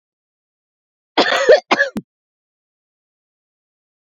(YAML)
cough_length: 4.0 s
cough_amplitude: 31024
cough_signal_mean_std_ratio: 0.28
survey_phase: beta (2021-08-13 to 2022-03-07)
age: 45-64
gender: Female
wearing_mask: 'No'
symptom_sore_throat: true
symptom_fatigue: true
symptom_headache: true
smoker_status: Never smoked
respiratory_condition_asthma: true
respiratory_condition_other: true
recruitment_source: REACT
submission_delay: 2 days
covid_test_result: Negative
covid_test_method: RT-qPCR